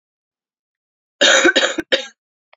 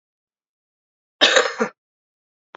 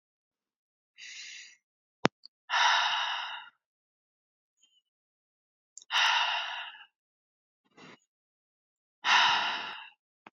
three_cough_length: 2.6 s
three_cough_amplitude: 31754
three_cough_signal_mean_std_ratio: 0.39
cough_length: 2.6 s
cough_amplitude: 29043
cough_signal_mean_std_ratio: 0.28
exhalation_length: 10.3 s
exhalation_amplitude: 29913
exhalation_signal_mean_std_ratio: 0.37
survey_phase: beta (2021-08-13 to 2022-03-07)
age: 18-44
gender: Female
wearing_mask: 'No'
symptom_cough_any: true
symptom_runny_or_blocked_nose: true
symptom_headache: true
symptom_other: true
smoker_status: Never smoked
respiratory_condition_asthma: false
respiratory_condition_other: false
recruitment_source: Test and Trace
submission_delay: 1 day
covid_test_result: Positive
covid_test_method: RT-qPCR
covid_ct_value: 25.2
covid_ct_gene: ORF1ab gene
covid_ct_mean: 25.9
covid_viral_load: 3100 copies/ml
covid_viral_load_category: Minimal viral load (< 10K copies/ml)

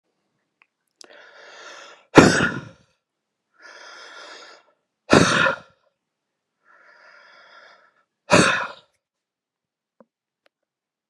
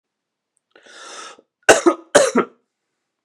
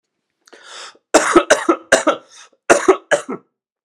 exhalation_length: 11.1 s
exhalation_amplitude: 32768
exhalation_signal_mean_std_ratio: 0.25
three_cough_length: 3.2 s
three_cough_amplitude: 32768
three_cough_signal_mean_std_ratio: 0.29
cough_length: 3.8 s
cough_amplitude: 32768
cough_signal_mean_std_ratio: 0.39
survey_phase: beta (2021-08-13 to 2022-03-07)
age: 18-44
gender: Male
wearing_mask: 'No'
symptom_new_continuous_cough: true
symptom_runny_or_blocked_nose: true
symptom_sore_throat: true
symptom_diarrhoea: true
symptom_fatigue: true
symptom_onset: 3 days
smoker_status: Never smoked
respiratory_condition_asthma: false
respiratory_condition_other: false
recruitment_source: Test and Trace
submission_delay: 1 day
covid_test_result: Positive
covid_test_method: RT-qPCR
covid_ct_value: 31.0
covid_ct_gene: ORF1ab gene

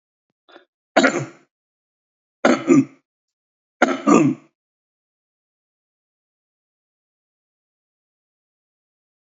three_cough_length: 9.2 s
three_cough_amplitude: 29213
three_cough_signal_mean_std_ratio: 0.25
survey_phase: alpha (2021-03-01 to 2021-08-12)
age: 65+
gender: Male
wearing_mask: 'No'
symptom_none: true
smoker_status: Never smoked
respiratory_condition_asthma: false
respiratory_condition_other: false
recruitment_source: REACT
submission_delay: 2 days
covid_test_result: Negative
covid_test_method: RT-qPCR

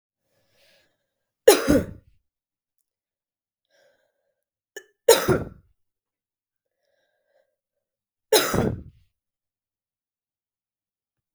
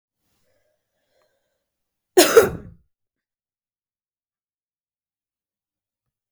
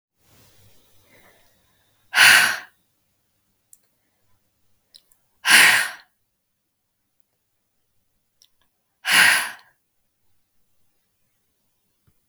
three_cough_length: 11.3 s
three_cough_amplitude: 32768
three_cough_signal_mean_std_ratio: 0.21
cough_length: 6.3 s
cough_amplitude: 32768
cough_signal_mean_std_ratio: 0.16
exhalation_length: 12.3 s
exhalation_amplitude: 32768
exhalation_signal_mean_std_ratio: 0.25
survey_phase: beta (2021-08-13 to 2022-03-07)
age: 18-44
gender: Female
wearing_mask: 'No'
symptom_runny_or_blocked_nose: true
symptom_sore_throat: true
symptom_headache: true
smoker_status: Never smoked
respiratory_condition_asthma: false
respiratory_condition_other: false
recruitment_source: Test and Trace
submission_delay: 2 days
covid_test_result: Positive
covid_test_method: RT-qPCR
covid_ct_value: 26.0
covid_ct_gene: ORF1ab gene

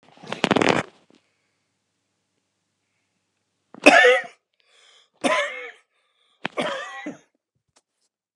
three_cough_length: 8.4 s
three_cough_amplitude: 32768
three_cough_signal_mean_std_ratio: 0.28
survey_phase: beta (2021-08-13 to 2022-03-07)
age: 65+
gender: Male
wearing_mask: 'No'
symptom_none: true
smoker_status: Never smoked
respiratory_condition_asthma: false
respiratory_condition_other: false
recruitment_source: REACT
submission_delay: 2 days
covid_test_result: Negative
covid_test_method: RT-qPCR
influenza_a_test_result: Negative
influenza_b_test_result: Negative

